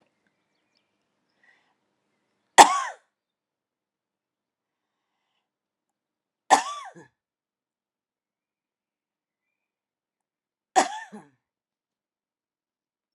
{"three_cough_length": "13.1 s", "three_cough_amplitude": 32768, "three_cough_signal_mean_std_ratio": 0.13, "survey_phase": "alpha (2021-03-01 to 2021-08-12)", "age": "45-64", "gender": "Female", "wearing_mask": "No", "symptom_none": true, "smoker_status": "Ex-smoker", "respiratory_condition_asthma": false, "respiratory_condition_other": false, "recruitment_source": "REACT", "submission_delay": "1 day", "covid_test_result": "Negative", "covid_test_method": "RT-qPCR"}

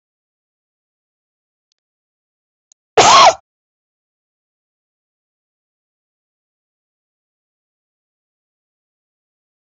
{"cough_length": "9.6 s", "cough_amplitude": 32347, "cough_signal_mean_std_ratio": 0.17, "survey_phase": "alpha (2021-03-01 to 2021-08-12)", "age": "45-64", "gender": "Female", "wearing_mask": "No", "symptom_cough_any": true, "symptom_fatigue": true, "symptom_onset": "12 days", "smoker_status": "Never smoked", "respiratory_condition_asthma": true, "respiratory_condition_other": false, "recruitment_source": "REACT", "submission_delay": "3 days", "covid_test_result": "Negative", "covid_test_method": "RT-qPCR"}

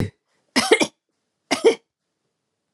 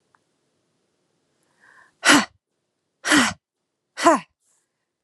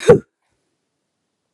{"three_cough_length": "2.7 s", "three_cough_amplitude": 26902, "three_cough_signal_mean_std_ratio": 0.32, "exhalation_length": "5.0 s", "exhalation_amplitude": 30621, "exhalation_signal_mean_std_ratio": 0.27, "cough_length": "1.5 s", "cough_amplitude": 32768, "cough_signal_mean_std_ratio": 0.22, "survey_phase": "alpha (2021-03-01 to 2021-08-12)", "age": "18-44", "gender": "Female", "wearing_mask": "No", "symptom_none": true, "smoker_status": "Never smoked", "respiratory_condition_asthma": false, "respiratory_condition_other": false, "recruitment_source": "REACT", "submission_delay": "2 days", "covid_test_result": "Negative", "covid_test_method": "RT-qPCR"}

